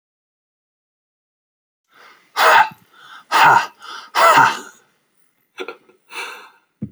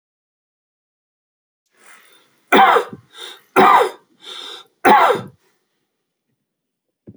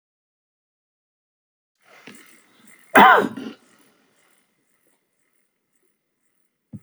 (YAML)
exhalation_length: 6.9 s
exhalation_amplitude: 32728
exhalation_signal_mean_std_ratio: 0.35
three_cough_length: 7.2 s
three_cough_amplitude: 30858
three_cough_signal_mean_std_ratio: 0.32
cough_length: 6.8 s
cough_amplitude: 31149
cough_signal_mean_std_ratio: 0.18
survey_phase: beta (2021-08-13 to 2022-03-07)
age: 45-64
gender: Male
wearing_mask: 'No'
symptom_none: true
smoker_status: Never smoked
respiratory_condition_asthma: false
respiratory_condition_other: false
recruitment_source: REACT
submission_delay: 2 days
covid_test_result: Negative
covid_test_method: RT-qPCR
influenza_a_test_result: Negative
influenza_b_test_result: Negative